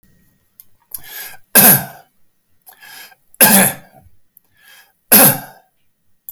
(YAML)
three_cough_length: 6.3 s
three_cough_amplitude: 32768
three_cough_signal_mean_std_ratio: 0.33
survey_phase: beta (2021-08-13 to 2022-03-07)
age: 65+
gender: Male
wearing_mask: 'No'
symptom_none: true
smoker_status: Never smoked
respiratory_condition_asthma: false
respiratory_condition_other: false
recruitment_source: REACT
submission_delay: 4 days
covid_test_result: Negative
covid_test_method: RT-qPCR
influenza_a_test_result: Negative
influenza_b_test_result: Negative